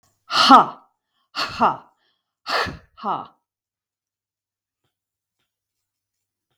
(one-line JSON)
{"exhalation_length": "6.6 s", "exhalation_amplitude": 32768, "exhalation_signal_mean_std_ratio": 0.26, "survey_phase": "beta (2021-08-13 to 2022-03-07)", "age": "45-64", "gender": "Female", "wearing_mask": "No", "symptom_none": true, "smoker_status": "Ex-smoker", "respiratory_condition_asthma": false, "respiratory_condition_other": false, "recruitment_source": "REACT", "submission_delay": "1 day", "covid_test_result": "Negative", "covid_test_method": "RT-qPCR"}